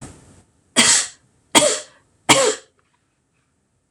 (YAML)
three_cough_length: 3.9 s
three_cough_amplitude: 26028
three_cough_signal_mean_std_ratio: 0.36
survey_phase: beta (2021-08-13 to 2022-03-07)
age: 45-64
gender: Female
wearing_mask: 'No'
symptom_none: true
smoker_status: Never smoked
respiratory_condition_asthma: false
respiratory_condition_other: false
recruitment_source: REACT
submission_delay: 1 day
covid_test_result: Negative
covid_test_method: RT-qPCR
influenza_a_test_result: Negative
influenza_b_test_result: Negative